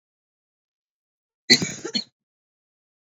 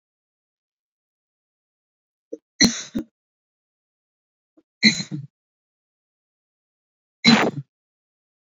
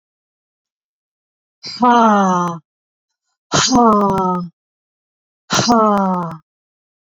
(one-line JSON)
{"cough_length": "3.2 s", "cough_amplitude": 29838, "cough_signal_mean_std_ratio": 0.2, "three_cough_length": "8.4 s", "three_cough_amplitude": 29477, "three_cough_signal_mean_std_ratio": 0.22, "exhalation_length": "7.1 s", "exhalation_amplitude": 27784, "exhalation_signal_mean_std_ratio": 0.51, "survey_phase": "beta (2021-08-13 to 2022-03-07)", "age": "45-64", "gender": "Female", "wearing_mask": "No", "symptom_cough_any": true, "symptom_runny_or_blocked_nose": true, "symptom_sore_throat": true, "symptom_headache": true, "symptom_change_to_sense_of_smell_or_taste": true, "smoker_status": "Never smoked", "respiratory_condition_asthma": true, "respiratory_condition_other": false, "recruitment_source": "Test and Trace", "submission_delay": "1 day", "covid_test_result": "Positive", "covid_test_method": "RT-qPCR", "covid_ct_value": 28.8, "covid_ct_gene": "N gene"}